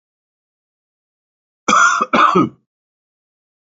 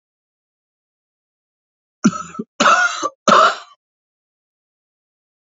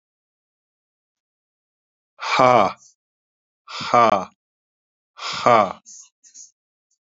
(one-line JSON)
{"cough_length": "3.8 s", "cough_amplitude": 28527, "cough_signal_mean_std_ratio": 0.36, "three_cough_length": "5.5 s", "three_cough_amplitude": 32767, "three_cough_signal_mean_std_ratio": 0.31, "exhalation_length": "7.1 s", "exhalation_amplitude": 30818, "exhalation_signal_mean_std_ratio": 0.29, "survey_phase": "beta (2021-08-13 to 2022-03-07)", "age": "45-64", "gender": "Male", "wearing_mask": "No", "symptom_cough_any": true, "symptom_new_continuous_cough": true, "symptom_runny_or_blocked_nose": true, "symptom_sore_throat": true, "symptom_fatigue": true, "symptom_fever_high_temperature": true, "symptom_headache": true, "symptom_onset": "3 days", "smoker_status": "Never smoked", "respiratory_condition_asthma": false, "respiratory_condition_other": false, "recruitment_source": "Test and Trace", "submission_delay": "2 days", "covid_test_result": "Positive", "covid_test_method": "RT-qPCR", "covid_ct_value": 29.5, "covid_ct_gene": "ORF1ab gene"}